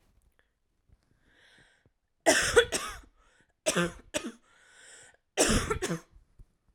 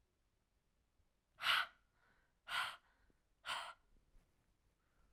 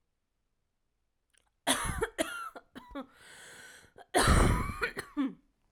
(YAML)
three_cough_length: 6.7 s
three_cough_amplitude: 14547
three_cough_signal_mean_std_ratio: 0.35
exhalation_length: 5.1 s
exhalation_amplitude: 2411
exhalation_signal_mean_std_ratio: 0.29
cough_length: 5.7 s
cough_amplitude: 8453
cough_signal_mean_std_ratio: 0.41
survey_phase: alpha (2021-03-01 to 2021-08-12)
age: 18-44
gender: Female
wearing_mask: 'No'
symptom_shortness_of_breath: true
symptom_abdominal_pain: true
symptom_diarrhoea: true
symptom_fatigue: true
symptom_headache: true
smoker_status: Ex-smoker
respiratory_condition_asthma: false
respiratory_condition_other: false
recruitment_source: REACT
submission_delay: 3 days
covid_test_result: Negative
covid_test_method: RT-qPCR